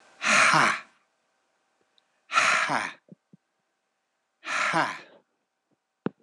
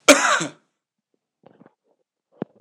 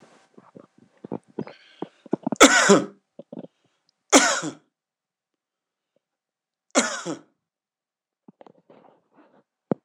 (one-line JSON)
{"exhalation_length": "6.2 s", "exhalation_amplitude": 16390, "exhalation_signal_mean_std_ratio": 0.4, "cough_length": "2.6 s", "cough_amplitude": 26028, "cough_signal_mean_std_ratio": 0.26, "three_cough_length": "9.8 s", "three_cough_amplitude": 26028, "three_cough_signal_mean_std_ratio": 0.24, "survey_phase": "beta (2021-08-13 to 2022-03-07)", "age": "45-64", "gender": "Male", "wearing_mask": "No", "symptom_none": true, "smoker_status": "Ex-smoker", "respiratory_condition_asthma": false, "respiratory_condition_other": false, "recruitment_source": "REACT", "submission_delay": "6 days", "covid_test_result": "Negative", "covid_test_method": "RT-qPCR"}